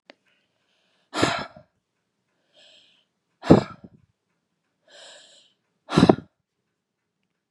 exhalation_length: 7.5 s
exhalation_amplitude: 32767
exhalation_signal_mean_std_ratio: 0.19
survey_phase: beta (2021-08-13 to 2022-03-07)
age: 45-64
gender: Female
wearing_mask: 'No'
symptom_cough_any: true
symptom_onset: 2 days
smoker_status: Never smoked
respiratory_condition_asthma: false
respiratory_condition_other: false
recruitment_source: Test and Trace
submission_delay: 1 day
covid_test_result: Negative
covid_test_method: RT-qPCR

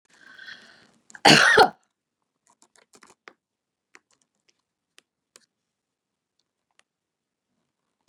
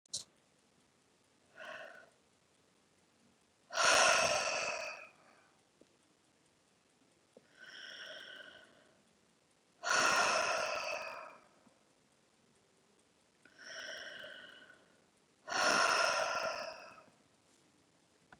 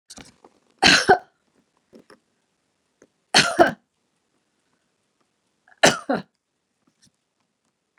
cough_length: 8.1 s
cough_amplitude: 30825
cough_signal_mean_std_ratio: 0.18
exhalation_length: 18.4 s
exhalation_amplitude: 5894
exhalation_signal_mean_std_ratio: 0.38
three_cough_length: 8.0 s
three_cough_amplitude: 32312
three_cough_signal_mean_std_ratio: 0.23
survey_phase: beta (2021-08-13 to 2022-03-07)
age: 65+
gender: Female
wearing_mask: 'No'
symptom_none: true
smoker_status: Never smoked
respiratory_condition_asthma: false
respiratory_condition_other: false
recruitment_source: REACT
submission_delay: 3 days
covid_test_result: Negative
covid_test_method: RT-qPCR
influenza_a_test_result: Negative
influenza_b_test_result: Negative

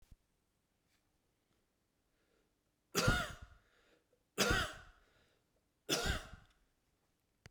three_cough_length: 7.5 s
three_cough_amplitude: 3993
three_cough_signal_mean_std_ratio: 0.3
survey_phase: beta (2021-08-13 to 2022-03-07)
age: 65+
gender: Male
wearing_mask: 'No'
symptom_none: true
smoker_status: Ex-smoker
respiratory_condition_asthma: true
respiratory_condition_other: false
recruitment_source: REACT
submission_delay: 1 day
covid_test_result: Negative
covid_test_method: RT-qPCR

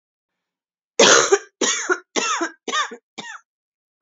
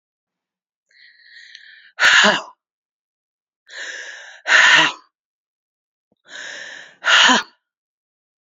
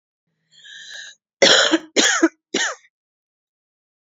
three_cough_length: 4.0 s
three_cough_amplitude: 31178
three_cough_signal_mean_std_ratio: 0.41
exhalation_length: 8.4 s
exhalation_amplitude: 31117
exhalation_signal_mean_std_ratio: 0.34
cough_length: 4.0 s
cough_amplitude: 28855
cough_signal_mean_std_ratio: 0.37
survey_phase: beta (2021-08-13 to 2022-03-07)
age: 45-64
gender: Female
wearing_mask: 'No'
symptom_cough_any: true
symptom_shortness_of_breath: true
symptom_sore_throat: true
symptom_fatigue: true
symptom_headache: true
symptom_onset: 2 days
smoker_status: Current smoker (1 to 10 cigarettes per day)
respiratory_condition_asthma: false
respiratory_condition_other: false
recruitment_source: Test and Trace
submission_delay: 1 day
covid_test_result: Positive
covid_test_method: RT-qPCR
covid_ct_value: 19.2
covid_ct_gene: ORF1ab gene
covid_ct_mean: 20.2
covid_viral_load: 240000 copies/ml
covid_viral_load_category: Low viral load (10K-1M copies/ml)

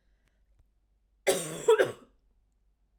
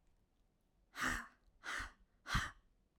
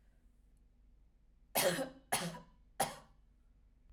cough_length: 3.0 s
cough_amplitude: 8629
cough_signal_mean_std_ratio: 0.3
exhalation_length: 3.0 s
exhalation_amplitude: 2440
exhalation_signal_mean_std_ratio: 0.41
three_cough_length: 3.9 s
three_cough_amplitude: 4096
three_cough_signal_mean_std_ratio: 0.37
survey_phase: alpha (2021-03-01 to 2021-08-12)
age: 18-44
gender: Female
wearing_mask: 'No'
symptom_none: true
smoker_status: Never smoked
respiratory_condition_asthma: false
respiratory_condition_other: false
recruitment_source: REACT
submission_delay: 2 days
covid_test_result: Negative
covid_test_method: RT-qPCR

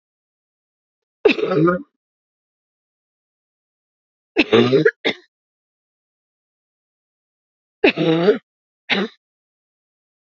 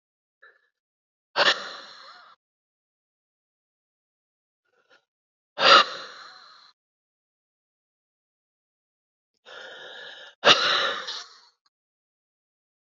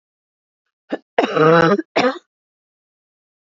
three_cough_length: 10.3 s
three_cough_amplitude: 29793
three_cough_signal_mean_std_ratio: 0.31
exhalation_length: 12.9 s
exhalation_amplitude: 26745
exhalation_signal_mean_std_ratio: 0.23
cough_length: 3.4 s
cough_amplitude: 29881
cough_signal_mean_std_ratio: 0.38
survey_phase: beta (2021-08-13 to 2022-03-07)
age: 45-64
gender: Female
wearing_mask: 'No'
symptom_cough_any: true
symptom_sore_throat: true
symptom_fatigue: true
symptom_headache: true
symptom_onset: 3 days
smoker_status: Ex-smoker
respiratory_condition_asthma: true
respiratory_condition_other: true
recruitment_source: Test and Trace
submission_delay: 3 days
covid_test_result: Positive
covid_test_method: RT-qPCR
covid_ct_value: 27.8
covid_ct_gene: N gene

